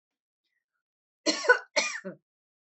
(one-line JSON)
{"cough_length": "2.7 s", "cough_amplitude": 15844, "cough_signal_mean_std_ratio": 0.28, "survey_phase": "alpha (2021-03-01 to 2021-08-12)", "age": "45-64", "gender": "Female", "wearing_mask": "No", "symptom_none": true, "smoker_status": "Never smoked", "respiratory_condition_asthma": false, "respiratory_condition_other": false, "recruitment_source": "REACT", "submission_delay": "1 day", "covid_test_result": "Negative", "covid_test_method": "RT-qPCR"}